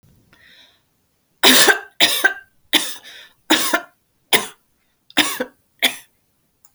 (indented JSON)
{
  "cough_length": "6.7 s",
  "cough_amplitude": 32768,
  "cough_signal_mean_std_ratio": 0.36,
  "survey_phase": "alpha (2021-03-01 to 2021-08-12)",
  "age": "45-64",
  "gender": "Female",
  "wearing_mask": "No",
  "symptom_none": true,
  "smoker_status": "Ex-smoker",
  "respiratory_condition_asthma": false,
  "respiratory_condition_other": false,
  "recruitment_source": "REACT",
  "submission_delay": "5 days",
  "covid_test_result": "Negative",
  "covid_test_method": "RT-qPCR"
}